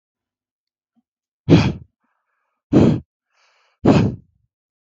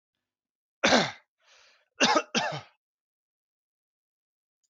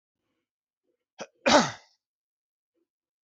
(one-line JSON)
{"exhalation_length": "4.9 s", "exhalation_amplitude": 32768, "exhalation_signal_mean_std_ratio": 0.32, "three_cough_length": "4.7 s", "three_cough_amplitude": 15902, "three_cough_signal_mean_std_ratio": 0.29, "cough_length": "3.2 s", "cough_amplitude": 22510, "cough_signal_mean_std_ratio": 0.21, "survey_phase": "beta (2021-08-13 to 2022-03-07)", "age": "18-44", "gender": "Male", "wearing_mask": "No", "symptom_none": true, "smoker_status": "Never smoked", "respiratory_condition_asthma": false, "respiratory_condition_other": false, "recruitment_source": "REACT", "submission_delay": "3 days", "covid_test_result": "Negative", "covid_test_method": "RT-qPCR"}